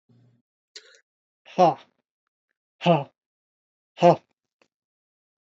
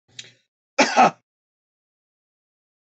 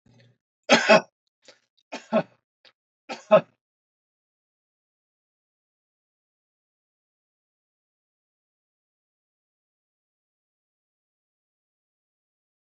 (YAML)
exhalation_length: 5.5 s
exhalation_amplitude: 19857
exhalation_signal_mean_std_ratio: 0.22
cough_length: 2.8 s
cough_amplitude: 24203
cough_signal_mean_std_ratio: 0.25
three_cough_length: 12.7 s
three_cough_amplitude: 23022
three_cough_signal_mean_std_ratio: 0.15
survey_phase: beta (2021-08-13 to 2022-03-07)
age: 65+
gender: Male
wearing_mask: 'No'
symptom_none: true
smoker_status: Never smoked
respiratory_condition_asthma: false
respiratory_condition_other: false
recruitment_source: REACT
submission_delay: 1 day
covid_test_result: Negative
covid_test_method: RT-qPCR
influenza_a_test_result: Negative
influenza_b_test_result: Negative